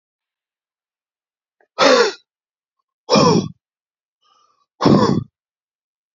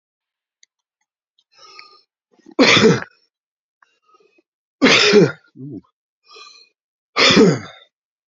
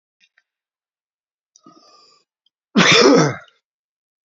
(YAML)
exhalation_length: 6.1 s
exhalation_amplitude: 31153
exhalation_signal_mean_std_ratio: 0.34
three_cough_length: 8.3 s
three_cough_amplitude: 32140
three_cough_signal_mean_std_ratio: 0.34
cough_length: 4.3 s
cough_amplitude: 31592
cough_signal_mean_std_ratio: 0.31
survey_phase: beta (2021-08-13 to 2022-03-07)
age: 45-64
gender: Male
wearing_mask: 'No'
symptom_cough_any: true
symptom_runny_or_blocked_nose: true
symptom_shortness_of_breath: true
symptom_sore_throat: true
symptom_fatigue: true
symptom_headache: true
symptom_onset: 3 days
smoker_status: Ex-smoker
respiratory_condition_asthma: false
respiratory_condition_other: false
recruitment_source: Test and Trace
submission_delay: 1 day
covid_test_result: Positive
covid_test_method: ePCR